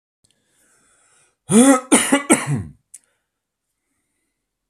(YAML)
cough_length: 4.7 s
cough_amplitude: 32768
cough_signal_mean_std_ratio: 0.33
survey_phase: alpha (2021-03-01 to 2021-08-12)
age: 45-64
gender: Male
wearing_mask: 'No'
symptom_cough_any: true
symptom_abdominal_pain: true
symptom_fatigue: true
symptom_fever_high_temperature: true
symptom_headache: true
symptom_onset: 3 days
smoker_status: Ex-smoker
respiratory_condition_asthma: false
respiratory_condition_other: false
recruitment_source: Test and Trace
submission_delay: 1 day
covid_test_result: Positive
covid_test_method: RT-qPCR
covid_ct_value: 19.3
covid_ct_gene: ORF1ab gene
covid_ct_mean: 19.8
covid_viral_load: 310000 copies/ml
covid_viral_load_category: Low viral load (10K-1M copies/ml)